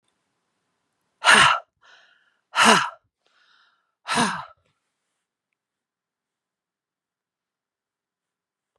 {"exhalation_length": "8.8 s", "exhalation_amplitude": 31688, "exhalation_signal_mean_std_ratio": 0.24, "survey_phase": "beta (2021-08-13 to 2022-03-07)", "age": "45-64", "gender": "Female", "wearing_mask": "No", "symptom_fatigue": true, "smoker_status": "Ex-smoker", "respiratory_condition_asthma": false, "respiratory_condition_other": false, "recruitment_source": "REACT", "submission_delay": "4 days", "covid_test_result": "Negative", "covid_test_method": "RT-qPCR", "influenza_a_test_result": "Unknown/Void", "influenza_b_test_result": "Unknown/Void"}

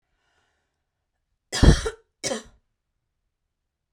{"cough_length": "3.9 s", "cough_amplitude": 24956, "cough_signal_mean_std_ratio": 0.21, "survey_phase": "beta (2021-08-13 to 2022-03-07)", "age": "18-44", "gender": "Female", "wearing_mask": "No", "symptom_runny_or_blocked_nose": true, "symptom_onset": "3 days", "smoker_status": "Never smoked", "respiratory_condition_asthma": false, "respiratory_condition_other": false, "recruitment_source": "REACT", "submission_delay": "1 day", "covid_test_result": "Negative", "covid_test_method": "RT-qPCR", "influenza_a_test_result": "Negative", "influenza_b_test_result": "Negative"}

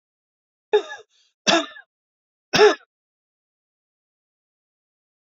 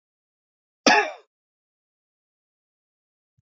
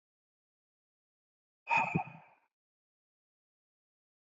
{"three_cough_length": "5.4 s", "three_cough_amplitude": 25363, "three_cough_signal_mean_std_ratio": 0.23, "cough_length": "3.4 s", "cough_amplitude": 30282, "cough_signal_mean_std_ratio": 0.19, "exhalation_length": "4.3 s", "exhalation_amplitude": 4071, "exhalation_signal_mean_std_ratio": 0.22, "survey_phase": "beta (2021-08-13 to 2022-03-07)", "age": "18-44", "gender": "Male", "wearing_mask": "No", "symptom_none": true, "symptom_onset": "12 days", "smoker_status": "Ex-smoker", "respiratory_condition_asthma": false, "respiratory_condition_other": false, "recruitment_source": "REACT", "submission_delay": "2 days", "covid_test_result": "Negative", "covid_test_method": "RT-qPCR", "influenza_a_test_result": "Negative", "influenza_b_test_result": "Negative"}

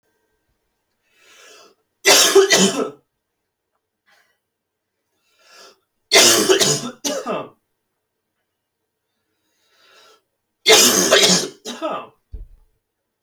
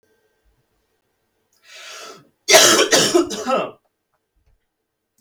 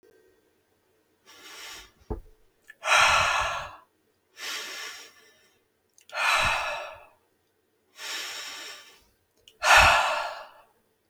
{"three_cough_length": "13.2 s", "three_cough_amplitude": 32768, "three_cough_signal_mean_std_ratio": 0.36, "cough_length": "5.2 s", "cough_amplitude": 32767, "cough_signal_mean_std_ratio": 0.35, "exhalation_length": "11.1 s", "exhalation_amplitude": 22361, "exhalation_signal_mean_std_ratio": 0.39, "survey_phase": "alpha (2021-03-01 to 2021-08-12)", "age": "18-44", "gender": "Male", "wearing_mask": "No", "symptom_headache": true, "symptom_onset": "12 days", "smoker_status": "Never smoked", "respiratory_condition_asthma": false, "respiratory_condition_other": false, "recruitment_source": "REACT", "submission_delay": "1 day", "covid_test_result": "Negative", "covid_test_method": "RT-qPCR"}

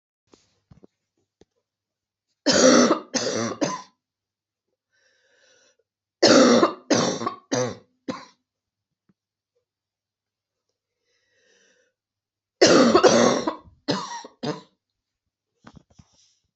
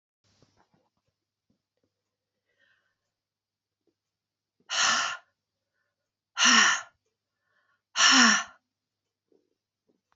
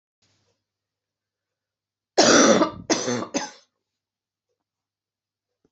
{"three_cough_length": "16.6 s", "three_cough_amplitude": 28262, "three_cough_signal_mean_std_ratio": 0.33, "exhalation_length": "10.2 s", "exhalation_amplitude": 18396, "exhalation_signal_mean_std_ratio": 0.27, "cough_length": "5.7 s", "cough_amplitude": 24463, "cough_signal_mean_std_ratio": 0.3, "survey_phase": "beta (2021-08-13 to 2022-03-07)", "age": "45-64", "gender": "Female", "wearing_mask": "No", "symptom_new_continuous_cough": true, "symptom_runny_or_blocked_nose": true, "symptom_sore_throat": true, "symptom_abdominal_pain": true, "symptom_fatigue": true, "symptom_fever_high_temperature": true, "symptom_other": true, "symptom_onset": "3 days", "smoker_status": "Never smoked", "respiratory_condition_asthma": false, "respiratory_condition_other": false, "recruitment_source": "Test and Trace", "submission_delay": "2 days", "covid_test_result": "Positive", "covid_test_method": "RT-qPCR", "covid_ct_value": 26.7, "covid_ct_gene": "ORF1ab gene", "covid_ct_mean": 27.6, "covid_viral_load": "920 copies/ml", "covid_viral_load_category": "Minimal viral load (< 10K copies/ml)"}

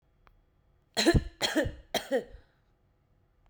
{"three_cough_length": "3.5 s", "three_cough_amplitude": 9357, "three_cough_signal_mean_std_ratio": 0.36, "survey_phase": "beta (2021-08-13 to 2022-03-07)", "age": "18-44", "gender": "Female", "wearing_mask": "No", "symptom_none": true, "smoker_status": "Current smoker (1 to 10 cigarettes per day)", "respiratory_condition_asthma": false, "respiratory_condition_other": false, "recruitment_source": "REACT", "submission_delay": "1 day", "covid_test_result": "Negative", "covid_test_method": "RT-qPCR"}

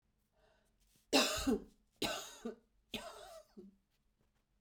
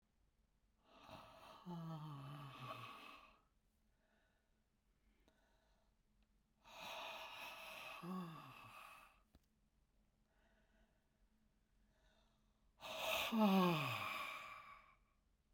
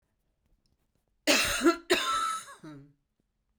{"three_cough_length": "4.6 s", "three_cough_amplitude": 5544, "three_cough_signal_mean_std_ratio": 0.35, "exhalation_length": "15.5 s", "exhalation_amplitude": 1647, "exhalation_signal_mean_std_ratio": 0.38, "cough_length": "3.6 s", "cough_amplitude": 11062, "cough_signal_mean_std_ratio": 0.43, "survey_phase": "beta (2021-08-13 to 2022-03-07)", "age": "65+", "gender": "Female", "wearing_mask": "No", "symptom_none": true, "smoker_status": "Never smoked", "respiratory_condition_asthma": false, "respiratory_condition_other": false, "recruitment_source": "REACT", "submission_delay": "2 days", "covid_test_result": "Negative", "covid_test_method": "RT-qPCR"}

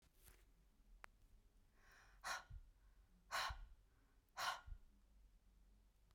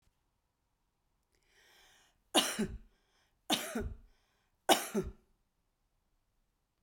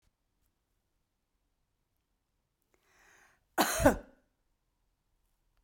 {"exhalation_length": "6.1 s", "exhalation_amplitude": 880, "exhalation_signal_mean_std_ratio": 0.43, "three_cough_length": "6.8 s", "three_cough_amplitude": 11505, "three_cough_signal_mean_std_ratio": 0.27, "cough_length": "5.6 s", "cough_amplitude": 10980, "cough_signal_mean_std_ratio": 0.19, "survey_phase": "beta (2021-08-13 to 2022-03-07)", "age": "45-64", "gender": "Female", "wearing_mask": "No", "symptom_none": true, "smoker_status": "Never smoked", "respiratory_condition_asthma": false, "respiratory_condition_other": false, "recruitment_source": "REACT", "submission_delay": "1 day", "covid_test_result": "Negative", "covid_test_method": "RT-qPCR"}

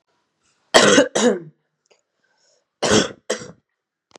{"cough_length": "4.2 s", "cough_amplitude": 32768, "cough_signal_mean_std_ratio": 0.35, "survey_phase": "beta (2021-08-13 to 2022-03-07)", "age": "18-44", "gender": "Female", "wearing_mask": "No", "symptom_new_continuous_cough": true, "symptom_runny_or_blocked_nose": true, "symptom_shortness_of_breath": true, "symptom_sore_throat": true, "symptom_headache": true, "symptom_change_to_sense_of_smell_or_taste": true, "symptom_other": true, "symptom_onset": "5 days", "smoker_status": "Current smoker (e-cigarettes or vapes only)", "respiratory_condition_asthma": false, "respiratory_condition_other": false, "recruitment_source": "Test and Trace", "submission_delay": "2 days", "covid_test_result": "Positive", "covid_test_method": "RT-qPCR", "covid_ct_value": 17.0, "covid_ct_gene": "ORF1ab gene", "covid_ct_mean": 17.3, "covid_viral_load": "2100000 copies/ml", "covid_viral_load_category": "High viral load (>1M copies/ml)"}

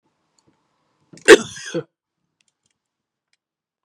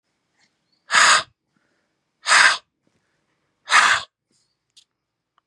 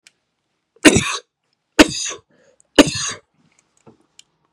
{"cough_length": "3.8 s", "cough_amplitude": 32768, "cough_signal_mean_std_ratio": 0.16, "exhalation_length": "5.5 s", "exhalation_amplitude": 30450, "exhalation_signal_mean_std_ratio": 0.32, "three_cough_length": "4.5 s", "three_cough_amplitude": 32768, "three_cough_signal_mean_std_ratio": 0.26, "survey_phase": "beta (2021-08-13 to 2022-03-07)", "age": "45-64", "gender": "Male", "wearing_mask": "No", "symptom_other": true, "symptom_onset": "2 days", "smoker_status": "Ex-smoker", "respiratory_condition_asthma": false, "respiratory_condition_other": false, "recruitment_source": "REACT", "submission_delay": "1 day", "covid_test_result": "Positive", "covid_test_method": "RT-qPCR", "covid_ct_value": 18.5, "covid_ct_gene": "E gene", "influenza_a_test_result": "Negative", "influenza_b_test_result": "Negative"}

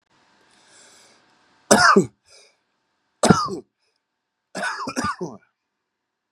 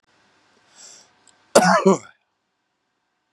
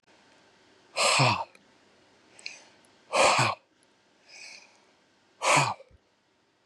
{"three_cough_length": "6.3 s", "three_cough_amplitude": 32768, "three_cough_signal_mean_std_ratio": 0.29, "cough_length": "3.3 s", "cough_amplitude": 32768, "cough_signal_mean_std_ratio": 0.27, "exhalation_length": "6.7 s", "exhalation_amplitude": 12599, "exhalation_signal_mean_std_ratio": 0.37, "survey_phase": "beta (2021-08-13 to 2022-03-07)", "age": "45-64", "gender": "Male", "wearing_mask": "No", "symptom_none": true, "smoker_status": "Never smoked", "respiratory_condition_asthma": false, "respiratory_condition_other": false, "recruitment_source": "REACT", "submission_delay": "1 day", "covid_test_result": "Negative", "covid_test_method": "RT-qPCR", "influenza_a_test_result": "Negative", "influenza_b_test_result": "Negative"}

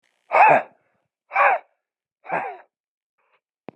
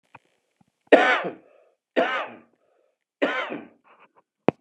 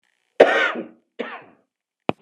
{"exhalation_length": "3.8 s", "exhalation_amplitude": 26737, "exhalation_signal_mean_std_ratio": 0.33, "three_cough_length": "4.6 s", "three_cough_amplitude": 31004, "three_cough_signal_mean_std_ratio": 0.31, "cough_length": "2.2 s", "cough_amplitude": 32768, "cough_signal_mean_std_ratio": 0.31, "survey_phase": "beta (2021-08-13 to 2022-03-07)", "age": "45-64", "gender": "Male", "wearing_mask": "No", "symptom_cough_any": true, "symptom_runny_or_blocked_nose": true, "symptom_sore_throat": true, "symptom_abdominal_pain": true, "symptom_fatigue": true, "symptom_headache": true, "symptom_onset": "4 days", "smoker_status": "Never smoked", "respiratory_condition_asthma": false, "respiratory_condition_other": false, "recruitment_source": "Test and Trace", "submission_delay": "1 day", "covid_test_result": "Positive", "covid_test_method": "RT-qPCR", "covid_ct_value": 20.1, "covid_ct_gene": "ORF1ab gene", "covid_ct_mean": 20.7, "covid_viral_load": "160000 copies/ml", "covid_viral_load_category": "Low viral load (10K-1M copies/ml)"}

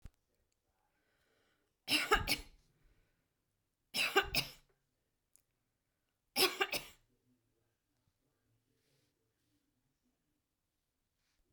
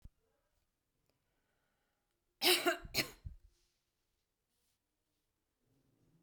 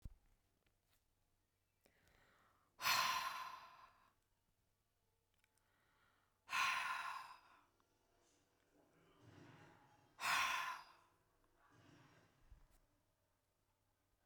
{"three_cough_length": "11.5 s", "three_cough_amplitude": 5870, "three_cough_signal_mean_std_ratio": 0.24, "cough_length": "6.2 s", "cough_amplitude": 5495, "cough_signal_mean_std_ratio": 0.22, "exhalation_length": "14.3 s", "exhalation_amplitude": 1888, "exhalation_signal_mean_std_ratio": 0.33, "survey_phase": "beta (2021-08-13 to 2022-03-07)", "age": "65+", "gender": "Female", "wearing_mask": "No", "symptom_none": true, "smoker_status": "Ex-smoker", "respiratory_condition_asthma": false, "respiratory_condition_other": false, "recruitment_source": "REACT", "submission_delay": "1 day", "covid_test_result": "Negative", "covid_test_method": "RT-qPCR"}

